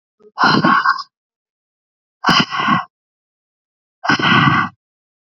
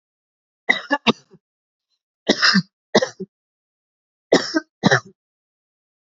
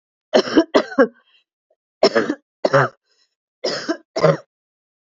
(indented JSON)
{
  "exhalation_length": "5.3 s",
  "exhalation_amplitude": 30819,
  "exhalation_signal_mean_std_ratio": 0.47,
  "three_cough_length": "6.1 s",
  "three_cough_amplitude": 30834,
  "three_cough_signal_mean_std_ratio": 0.29,
  "cough_length": "5.0 s",
  "cough_amplitude": 28385,
  "cough_signal_mean_std_ratio": 0.38,
  "survey_phase": "alpha (2021-03-01 to 2021-08-12)",
  "age": "18-44",
  "gender": "Female",
  "wearing_mask": "No",
  "symptom_none": true,
  "smoker_status": "Ex-smoker",
  "respiratory_condition_asthma": false,
  "respiratory_condition_other": false,
  "recruitment_source": "REACT",
  "submission_delay": "2 days",
  "covid_test_result": "Negative",
  "covid_test_method": "RT-qPCR"
}